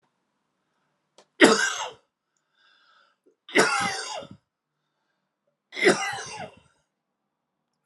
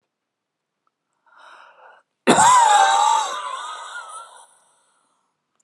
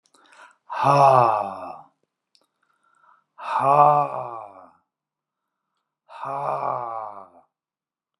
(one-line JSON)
{"three_cough_length": "7.9 s", "three_cough_amplitude": 31611, "three_cough_signal_mean_std_ratio": 0.3, "cough_length": "5.6 s", "cough_amplitude": 28717, "cough_signal_mean_std_ratio": 0.41, "exhalation_length": "8.2 s", "exhalation_amplitude": 26830, "exhalation_signal_mean_std_ratio": 0.39, "survey_phase": "alpha (2021-03-01 to 2021-08-12)", "age": "65+", "gender": "Male", "wearing_mask": "No", "symptom_none": true, "smoker_status": "Ex-smoker", "respiratory_condition_asthma": false, "respiratory_condition_other": false, "recruitment_source": "REACT", "submission_delay": "1 day", "covid_test_result": "Negative", "covid_test_method": "RT-qPCR"}